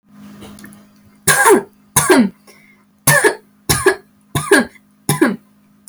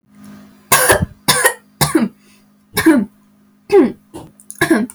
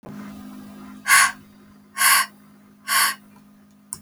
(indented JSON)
{
  "three_cough_length": "5.9 s",
  "three_cough_amplitude": 32768,
  "three_cough_signal_mean_std_ratio": 0.45,
  "cough_length": "4.9 s",
  "cough_amplitude": 32768,
  "cough_signal_mean_std_ratio": 0.47,
  "exhalation_length": "4.0 s",
  "exhalation_amplitude": 30419,
  "exhalation_signal_mean_std_ratio": 0.41,
  "survey_phase": "alpha (2021-03-01 to 2021-08-12)",
  "age": "18-44",
  "gender": "Female",
  "wearing_mask": "No",
  "symptom_none": true,
  "smoker_status": "Never smoked",
  "respiratory_condition_asthma": false,
  "respiratory_condition_other": false,
  "recruitment_source": "REACT",
  "submission_delay": "1 day",
  "covid_test_result": "Negative",
  "covid_test_method": "RT-qPCR"
}